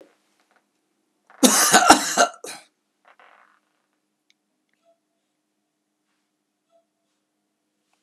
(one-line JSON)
{"cough_length": "8.0 s", "cough_amplitude": 32768, "cough_signal_mean_std_ratio": 0.23, "survey_phase": "beta (2021-08-13 to 2022-03-07)", "age": "65+", "gender": "Male", "wearing_mask": "No", "symptom_runny_or_blocked_nose": true, "symptom_onset": "2 days", "smoker_status": "Never smoked", "respiratory_condition_asthma": false, "respiratory_condition_other": false, "recruitment_source": "Test and Trace", "submission_delay": "1 day", "covid_test_result": "Positive", "covid_test_method": "RT-qPCR", "covid_ct_value": 25.3, "covid_ct_gene": "ORF1ab gene", "covid_ct_mean": 26.1, "covid_viral_load": "2800 copies/ml", "covid_viral_load_category": "Minimal viral load (< 10K copies/ml)"}